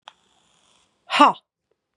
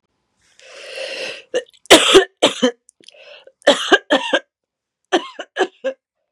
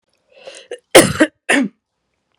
{
  "exhalation_length": "2.0 s",
  "exhalation_amplitude": 31768,
  "exhalation_signal_mean_std_ratio": 0.24,
  "three_cough_length": "6.3 s",
  "three_cough_amplitude": 32768,
  "three_cough_signal_mean_std_ratio": 0.36,
  "cough_length": "2.4 s",
  "cough_amplitude": 32768,
  "cough_signal_mean_std_ratio": 0.32,
  "survey_phase": "beta (2021-08-13 to 2022-03-07)",
  "age": "45-64",
  "gender": "Female",
  "wearing_mask": "No",
  "symptom_cough_any": true,
  "symptom_runny_or_blocked_nose": true,
  "symptom_onset": "4 days",
  "smoker_status": "Ex-smoker",
  "respiratory_condition_asthma": true,
  "respiratory_condition_other": false,
  "recruitment_source": "Test and Trace",
  "submission_delay": "1 day",
  "covid_test_result": "Positive",
  "covid_test_method": "RT-qPCR",
  "covid_ct_value": 23.7,
  "covid_ct_gene": "N gene"
}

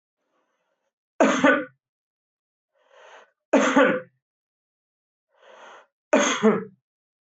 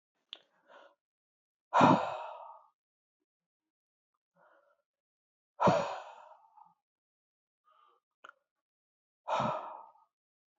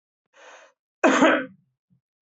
{
  "three_cough_length": "7.3 s",
  "three_cough_amplitude": 21942,
  "three_cough_signal_mean_std_ratio": 0.34,
  "exhalation_length": "10.6 s",
  "exhalation_amplitude": 10240,
  "exhalation_signal_mean_std_ratio": 0.25,
  "cough_length": "2.2 s",
  "cough_amplitude": 22611,
  "cough_signal_mean_std_ratio": 0.35,
  "survey_phase": "beta (2021-08-13 to 2022-03-07)",
  "age": "45-64",
  "gender": "Male",
  "wearing_mask": "No",
  "symptom_none": true,
  "smoker_status": "Never smoked",
  "respiratory_condition_asthma": false,
  "respiratory_condition_other": false,
  "recruitment_source": "REACT",
  "submission_delay": "2 days",
  "covid_test_result": "Negative",
  "covid_test_method": "RT-qPCR",
  "influenza_a_test_result": "Negative",
  "influenza_b_test_result": "Negative"
}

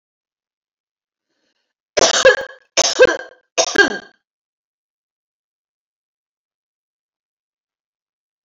{
  "three_cough_length": "8.4 s",
  "three_cough_amplitude": 31621,
  "three_cough_signal_mean_std_ratio": 0.25,
  "survey_phase": "alpha (2021-03-01 to 2021-08-12)",
  "age": "45-64",
  "gender": "Female",
  "wearing_mask": "No",
  "symptom_none": true,
  "smoker_status": "Ex-smoker",
  "respiratory_condition_asthma": false,
  "respiratory_condition_other": false,
  "recruitment_source": "REACT",
  "submission_delay": "2 days",
  "covid_test_result": "Negative",
  "covid_test_method": "RT-qPCR"
}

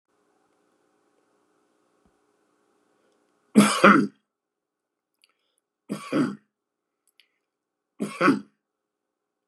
{
  "three_cough_length": "9.5 s",
  "three_cough_amplitude": 30644,
  "three_cough_signal_mean_std_ratio": 0.23,
  "survey_phase": "beta (2021-08-13 to 2022-03-07)",
  "age": "65+",
  "gender": "Male",
  "wearing_mask": "No",
  "symptom_cough_any": true,
  "symptom_runny_or_blocked_nose": true,
  "smoker_status": "Ex-smoker",
  "respiratory_condition_asthma": false,
  "respiratory_condition_other": false,
  "recruitment_source": "Test and Trace",
  "submission_delay": "0 days",
  "covid_test_result": "Positive",
  "covid_test_method": "LFT"
}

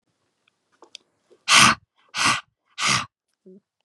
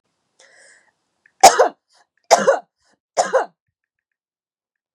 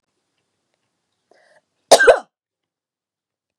{
  "exhalation_length": "3.8 s",
  "exhalation_amplitude": 30151,
  "exhalation_signal_mean_std_ratio": 0.33,
  "three_cough_length": "4.9 s",
  "three_cough_amplitude": 32768,
  "three_cough_signal_mean_std_ratio": 0.26,
  "cough_length": "3.6 s",
  "cough_amplitude": 32768,
  "cough_signal_mean_std_ratio": 0.19,
  "survey_phase": "beta (2021-08-13 to 2022-03-07)",
  "age": "18-44",
  "gender": "Female",
  "wearing_mask": "No",
  "symptom_none": true,
  "smoker_status": "Never smoked",
  "respiratory_condition_asthma": false,
  "respiratory_condition_other": false,
  "recruitment_source": "REACT",
  "submission_delay": "11 days",
  "covid_test_result": "Negative",
  "covid_test_method": "RT-qPCR"
}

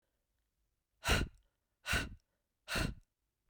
{
  "exhalation_length": "3.5 s",
  "exhalation_amplitude": 4387,
  "exhalation_signal_mean_std_ratio": 0.35,
  "survey_phase": "beta (2021-08-13 to 2022-03-07)",
  "age": "18-44",
  "gender": "Female",
  "wearing_mask": "No",
  "symptom_runny_or_blocked_nose": true,
  "symptom_headache": true,
  "symptom_other": true,
  "smoker_status": "Never smoked",
  "respiratory_condition_asthma": false,
  "respiratory_condition_other": false,
  "recruitment_source": "Test and Trace",
  "submission_delay": "2 days",
  "covid_test_result": "Positive",
  "covid_test_method": "RT-qPCR",
  "covid_ct_value": 22.2,
  "covid_ct_gene": "ORF1ab gene",
  "covid_ct_mean": 22.8,
  "covid_viral_load": "33000 copies/ml",
  "covid_viral_load_category": "Low viral load (10K-1M copies/ml)"
}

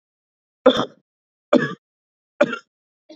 {
  "three_cough_length": "3.2 s",
  "three_cough_amplitude": 29807,
  "three_cough_signal_mean_std_ratio": 0.26,
  "survey_phase": "beta (2021-08-13 to 2022-03-07)",
  "age": "18-44",
  "gender": "Male",
  "wearing_mask": "No",
  "symptom_none": true,
  "smoker_status": "Never smoked",
  "respiratory_condition_asthma": false,
  "respiratory_condition_other": false,
  "recruitment_source": "REACT",
  "submission_delay": "1 day",
  "covid_test_result": "Negative",
  "covid_test_method": "RT-qPCR",
  "influenza_a_test_result": "Unknown/Void",
  "influenza_b_test_result": "Unknown/Void"
}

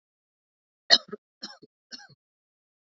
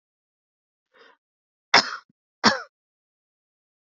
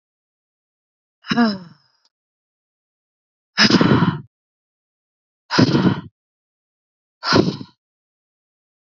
{
  "three_cough_length": "3.0 s",
  "three_cough_amplitude": 25992,
  "three_cough_signal_mean_std_ratio": 0.14,
  "cough_length": "3.9 s",
  "cough_amplitude": 27945,
  "cough_signal_mean_std_ratio": 0.19,
  "exhalation_length": "8.9 s",
  "exhalation_amplitude": 30564,
  "exhalation_signal_mean_std_ratio": 0.33,
  "survey_phase": "beta (2021-08-13 to 2022-03-07)",
  "age": "18-44",
  "gender": "Female",
  "wearing_mask": "No",
  "symptom_runny_or_blocked_nose": true,
  "smoker_status": "Never smoked",
  "respiratory_condition_asthma": false,
  "respiratory_condition_other": false,
  "recruitment_source": "REACT",
  "submission_delay": "3 days",
  "covid_test_result": "Negative",
  "covid_test_method": "RT-qPCR",
  "influenza_a_test_result": "Negative",
  "influenza_b_test_result": "Negative"
}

